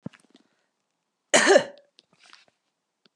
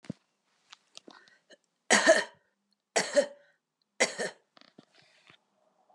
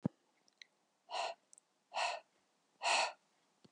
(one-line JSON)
{"cough_length": "3.2 s", "cough_amplitude": 23075, "cough_signal_mean_std_ratio": 0.24, "three_cough_length": "5.9 s", "three_cough_amplitude": 12815, "three_cough_signal_mean_std_ratio": 0.27, "exhalation_length": "3.7 s", "exhalation_amplitude": 3049, "exhalation_signal_mean_std_ratio": 0.36, "survey_phase": "beta (2021-08-13 to 2022-03-07)", "age": "45-64", "gender": "Female", "wearing_mask": "No", "symptom_sore_throat": true, "symptom_onset": "12 days", "smoker_status": "Ex-smoker", "respiratory_condition_asthma": false, "respiratory_condition_other": false, "recruitment_source": "REACT", "submission_delay": "1 day", "covid_test_result": "Negative", "covid_test_method": "RT-qPCR", "influenza_a_test_result": "Negative", "influenza_b_test_result": "Negative"}